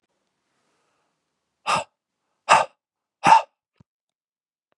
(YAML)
exhalation_length: 4.8 s
exhalation_amplitude: 29095
exhalation_signal_mean_std_ratio: 0.23
survey_phase: beta (2021-08-13 to 2022-03-07)
age: 45-64
gender: Male
wearing_mask: 'No'
symptom_cough_any: true
symptom_runny_or_blocked_nose: true
symptom_fatigue: true
symptom_change_to_sense_of_smell_or_taste: true
symptom_onset: 4 days
smoker_status: Never smoked
respiratory_condition_asthma: false
respiratory_condition_other: false
recruitment_source: Test and Trace
submission_delay: 2 days
covid_test_result: Positive
covid_test_method: RT-qPCR
covid_ct_value: 17.6
covid_ct_gene: ORF1ab gene
covid_ct_mean: 18.4
covid_viral_load: 890000 copies/ml
covid_viral_load_category: Low viral load (10K-1M copies/ml)